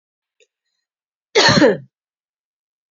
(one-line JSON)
{"cough_length": "2.9 s", "cough_amplitude": 30183, "cough_signal_mean_std_ratio": 0.31, "survey_phase": "beta (2021-08-13 to 2022-03-07)", "age": "45-64", "gender": "Female", "wearing_mask": "No", "symptom_none": true, "smoker_status": "Never smoked", "respiratory_condition_asthma": false, "respiratory_condition_other": false, "recruitment_source": "REACT", "submission_delay": "1 day", "covid_test_result": "Negative", "covid_test_method": "RT-qPCR", "influenza_a_test_result": "Negative", "influenza_b_test_result": "Negative"}